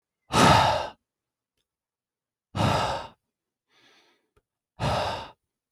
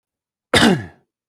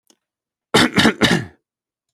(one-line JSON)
{"exhalation_length": "5.7 s", "exhalation_amplitude": 17916, "exhalation_signal_mean_std_ratio": 0.37, "cough_length": "1.3 s", "cough_amplitude": 32767, "cough_signal_mean_std_ratio": 0.38, "three_cough_length": "2.1 s", "three_cough_amplitude": 32768, "three_cough_signal_mean_std_ratio": 0.4, "survey_phase": "alpha (2021-03-01 to 2021-08-12)", "age": "18-44", "gender": "Male", "wearing_mask": "No", "symptom_none": true, "smoker_status": "Never smoked", "respiratory_condition_asthma": false, "respiratory_condition_other": false, "recruitment_source": "REACT", "submission_delay": "1 day", "covid_test_result": "Negative", "covid_test_method": "RT-qPCR"}